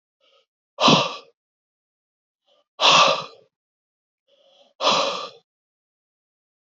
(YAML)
exhalation_length: 6.7 s
exhalation_amplitude: 25420
exhalation_signal_mean_std_ratio: 0.31
survey_phase: alpha (2021-03-01 to 2021-08-12)
age: 65+
gender: Male
wearing_mask: 'No'
symptom_none: true
smoker_status: Never smoked
respiratory_condition_asthma: false
respiratory_condition_other: false
recruitment_source: REACT
submission_delay: 1 day
covid_test_result: Negative
covid_test_method: RT-qPCR